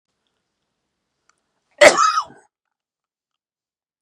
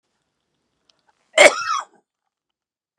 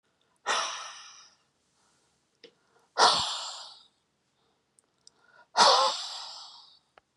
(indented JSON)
{
  "cough_length": "4.0 s",
  "cough_amplitude": 32768,
  "cough_signal_mean_std_ratio": 0.22,
  "three_cough_length": "3.0 s",
  "three_cough_amplitude": 32768,
  "three_cough_signal_mean_std_ratio": 0.22,
  "exhalation_length": "7.2 s",
  "exhalation_amplitude": 16697,
  "exhalation_signal_mean_std_ratio": 0.33,
  "survey_phase": "beta (2021-08-13 to 2022-03-07)",
  "age": "65+",
  "gender": "Male",
  "wearing_mask": "No",
  "symptom_none": true,
  "smoker_status": "Never smoked",
  "respiratory_condition_asthma": false,
  "respiratory_condition_other": false,
  "recruitment_source": "REACT",
  "submission_delay": "2 days",
  "covid_test_result": "Negative",
  "covid_test_method": "RT-qPCR",
  "influenza_a_test_result": "Negative",
  "influenza_b_test_result": "Negative"
}